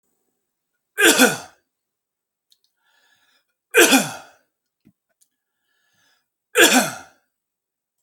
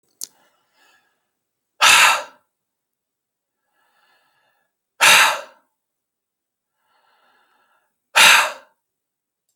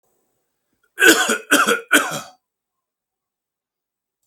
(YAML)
three_cough_length: 8.0 s
three_cough_amplitude: 32767
three_cough_signal_mean_std_ratio: 0.28
exhalation_length: 9.6 s
exhalation_amplitude: 32768
exhalation_signal_mean_std_ratio: 0.27
cough_length: 4.3 s
cough_amplitude: 32767
cough_signal_mean_std_ratio: 0.34
survey_phase: alpha (2021-03-01 to 2021-08-12)
age: 45-64
gender: Male
wearing_mask: 'No'
symptom_none: true
smoker_status: Ex-smoker
respiratory_condition_asthma: false
respiratory_condition_other: false
recruitment_source: REACT
submission_delay: 5 days
covid_test_result: Negative
covid_test_method: RT-qPCR